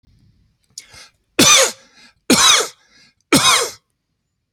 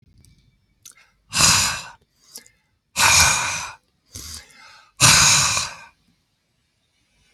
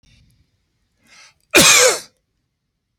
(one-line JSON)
{"three_cough_length": "4.5 s", "three_cough_amplitude": 32767, "three_cough_signal_mean_std_ratio": 0.4, "exhalation_length": "7.3 s", "exhalation_amplitude": 32768, "exhalation_signal_mean_std_ratio": 0.4, "cough_length": "3.0 s", "cough_amplitude": 32768, "cough_signal_mean_std_ratio": 0.32, "survey_phase": "alpha (2021-03-01 to 2021-08-12)", "age": "45-64", "gender": "Male", "wearing_mask": "No", "symptom_none": true, "smoker_status": "Ex-smoker", "respiratory_condition_asthma": false, "respiratory_condition_other": false, "recruitment_source": "REACT", "submission_delay": "2 days", "covid_test_result": "Negative", "covid_test_method": "RT-qPCR"}